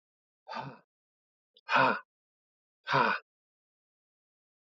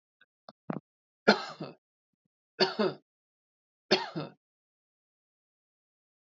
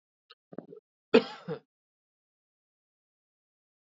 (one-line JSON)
{"exhalation_length": "4.6 s", "exhalation_amplitude": 7922, "exhalation_signal_mean_std_ratio": 0.3, "three_cough_length": "6.2 s", "three_cough_amplitude": 13846, "three_cough_signal_mean_std_ratio": 0.24, "cough_length": "3.8 s", "cough_amplitude": 16218, "cough_signal_mean_std_ratio": 0.15, "survey_phase": "beta (2021-08-13 to 2022-03-07)", "age": "45-64", "gender": "Male", "wearing_mask": "No", "symptom_sore_throat": true, "symptom_fatigue": true, "symptom_headache": true, "symptom_onset": "3 days", "smoker_status": "Never smoked", "respiratory_condition_asthma": false, "respiratory_condition_other": false, "recruitment_source": "Test and Trace", "submission_delay": "2 days", "covid_test_result": "Positive", "covid_test_method": "RT-qPCR", "covid_ct_value": 29.4, "covid_ct_gene": "N gene", "covid_ct_mean": 29.6, "covid_viral_load": "190 copies/ml", "covid_viral_load_category": "Minimal viral load (< 10K copies/ml)"}